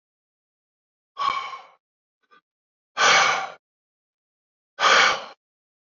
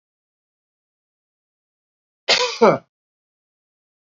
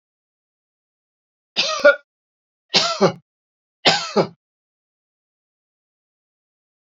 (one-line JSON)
{"exhalation_length": "5.9 s", "exhalation_amplitude": 19871, "exhalation_signal_mean_std_ratio": 0.35, "cough_length": "4.2 s", "cough_amplitude": 27669, "cough_signal_mean_std_ratio": 0.22, "three_cough_length": "6.9 s", "three_cough_amplitude": 30334, "three_cough_signal_mean_std_ratio": 0.27, "survey_phase": "beta (2021-08-13 to 2022-03-07)", "age": "65+", "gender": "Male", "wearing_mask": "No", "symptom_none": true, "smoker_status": "Never smoked", "respiratory_condition_asthma": false, "respiratory_condition_other": false, "recruitment_source": "REACT", "submission_delay": "1 day", "covid_test_result": "Negative", "covid_test_method": "RT-qPCR", "influenza_a_test_result": "Negative", "influenza_b_test_result": "Negative"}